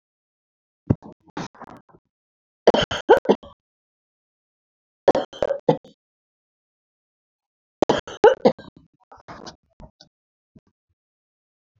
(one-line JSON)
{"three_cough_length": "11.8 s", "three_cough_amplitude": 27674, "three_cough_signal_mean_std_ratio": 0.21, "survey_phase": "beta (2021-08-13 to 2022-03-07)", "age": "65+", "gender": "Female", "wearing_mask": "No", "symptom_none": true, "smoker_status": "Ex-smoker", "respiratory_condition_asthma": false, "respiratory_condition_other": false, "recruitment_source": "REACT", "submission_delay": "4 days", "covid_test_result": "Negative", "covid_test_method": "RT-qPCR"}